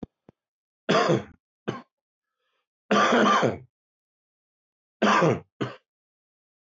{"three_cough_length": "6.7 s", "three_cough_amplitude": 14215, "three_cough_signal_mean_std_ratio": 0.39, "survey_phase": "beta (2021-08-13 to 2022-03-07)", "age": "45-64", "gender": "Male", "wearing_mask": "No", "symptom_none": true, "symptom_onset": "11 days", "smoker_status": "Ex-smoker", "respiratory_condition_asthma": false, "respiratory_condition_other": false, "recruitment_source": "REACT", "submission_delay": "3 days", "covid_test_result": "Negative", "covid_test_method": "RT-qPCR", "influenza_a_test_result": "Negative", "influenza_b_test_result": "Negative"}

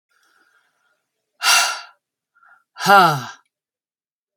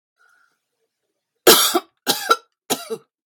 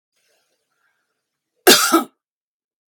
{"exhalation_length": "4.4 s", "exhalation_amplitude": 32767, "exhalation_signal_mean_std_ratio": 0.31, "three_cough_length": "3.3 s", "three_cough_amplitude": 32768, "three_cough_signal_mean_std_ratio": 0.32, "cough_length": "2.9 s", "cough_amplitude": 32768, "cough_signal_mean_std_ratio": 0.26, "survey_phase": "beta (2021-08-13 to 2022-03-07)", "age": "45-64", "gender": "Female", "wearing_mask": "No", "symptom_none": true, "smoker_status": "Never smoked", "respiratory_condition_asthma": false, "respiratory_condition_other": false, "recruitment_source": "REACT", "submission_delay": "4 days", "covid_test_result": "Negative", "covid_test_method": "RT-qPCR"}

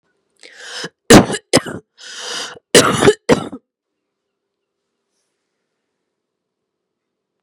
{"cough_length": "7.4 s", "cough_amplitude": 32768, "cough_signal_mean_std_ratio": 0.27, "survey_phase": "beta (2021-08-13 to 2022-03-07)", "age": "18-44", "gender": "Female", "wearing_mask": "No", "symptom_cough_any": true, "symptom_sore_throat": true, "symptom_onset": "10 days", "smoker_status": "Ex-smoker", "respiratory_condition_asthma": false, "respiratory_condition_other": false, "recruitment_source": "REACT", "submission_delay": "2 days", "covid_test_result": "Negative", "covid_test_method": "RT-qPCR", "influenza_a_test_result": "Negative", "influenza_b_test_result": "Negative"}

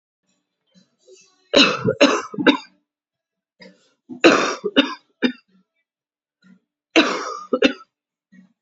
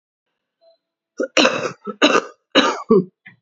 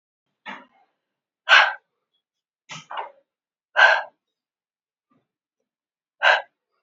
{"three_cough_length": "8.6 s", "three_cough_amplitude": 29999, "three_cough_signal_mean_std_ratio": 0.34, "cough_length": "3.4 s", "cough_amplitude": 32768, "cough_signal_mean_std_ratio": 0.41, "exhalation_length": "6.8 s", "exhalation_amplitude": 29278, "exhalation_signal_mean_std_ratio": 0.25, "survey_phase": "alpha (2021-03-01 to 2021-08-12)", "age": "18-44", "gender": "Female", "wearing_mask": "No", "symptom_cough_any": true, "symptom_new_continuous_cough": true, "symptom_shortness_of_breath": true, "symptom_fatigue": true, "symptom_fever_high_temperature": true, "symptom_change_to_sense_of_smell_or_taste": true, "symptom_loss_of_taste": true, "symptom_onset": "6 days", "smoker_status": "Never smoked", "respiratory_condition_asthma": false, "respiratory_condition_other": false, "recruitment_source": "Test and Trace", "submission_delay": "2 days", "covid_test_result": "Positive", "covid_test_method": "RT-qPCR", "covid_ct_value": 15.1, "covid_ct_gene": "ORF1ab gene", "covid_ct_mean": 15.4, "covid_viral_load": "9000000 copies/ml", "covid_viral_load_category": "High viral load (>1M copies/ml)"}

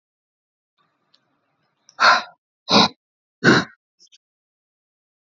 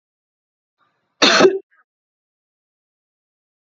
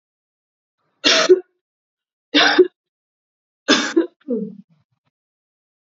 {"exhalation_length": "5.3 s", "exhalation_amplitude": 29916, "exhalation_signal_mean_std_ratio": 0.26, "cough_length": "3.7 s", "cough_amplitude": 31468, "cough_signal_mean_std_ratio": 0.24, "three_cough_length": "6.0 s", "three_cough_amplitude": 30470, "three_cough_signal_mean_std_ratio": 0.33, "survey_phase": "beta (2021-08-13 to 2022-03-07)", "age": "18-44", "gender": "Female", "wearing_mask": "No", "symptom_none": true, "smoker_status": "Never smoked", "respiratory_condition_asthma": false, "respiratory_condition_other": false, "recruitment_source": "REACT", "submission_delay": "2 days", "covid_test_result": "Negative", "covid_test_method": "RT-qPCR", "influenza_a_test_result": "Negative", "influenza_b_test_result": "Negative"}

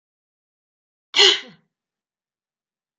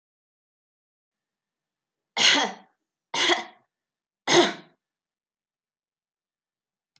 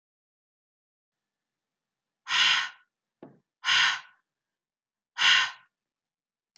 {"cough_length": "3.0 s", "cough_amplitude": 30777, "cough_signal_mean_std_ratio": 0.21, "three_cough_length": "7.0 s", "three_cough_amplitude": 19272, "three_cough_signal_mean_std_ratio": 0.27, "exhalation_length": "6.6 s", "exhalation_amplitude": 11982, "exhalation_signal_mean_std_ratio": 0.31, "survey_phase": "beta (2021-08-13 to 2022-03-07)", "age": "45-64", "gender": "Female", "wearing_mask": "No", "symptom_none": true, "smoker_status": "Never smoked", "respiratory_condition_asthma": false, "respiratory_condition_other": false, "recruitment_source": "REACT", "submission_delay": "2 days", "covid_test_result": "Negative", "covid_test_method": "RT-qPCR", "influenza_a_test_result": "Unknown/Void", "influenza_b_test_result": "Unknown/Void"}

